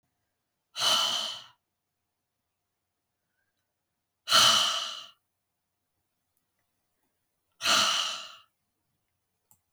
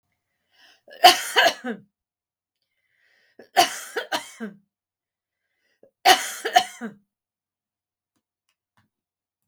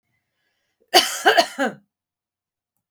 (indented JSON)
{
  "exhalation_length": "9.7 s",
  "exhalation_amplitude": 13322,
  "exhalation_signal_mean_std_ratio": 0.33,
  "three_cough_length": "9.5 s",
  "three_cough_amplitude": 32768,
  "three_cough_signal_mean_std_ratio": 0.25,
  "cough_length": "2.9 s",
  "cough_amplitude": 32768,
  "cough_signal_mean_std_ratio": 0.31,
  "survey_phase": "beta (2021-08-13 to 2022-03-07)",
  "age": "45-64",
  "gender": "Female",
  "wearing_mask": "No",
  "symptom_runny_or_blocked_nose": true,
  "symptom_other": true,
  "smoker_status": "Ex-smoker",
  "respiratory_condition_asthma": false,
  "respiratory_condition_other": false,
  "recruitment_source": "Test and Trace",
  "submission_delay": "1 day",
  "covid_test_result": "Positive",
  "covid_test_method": "RT-qPCR"
}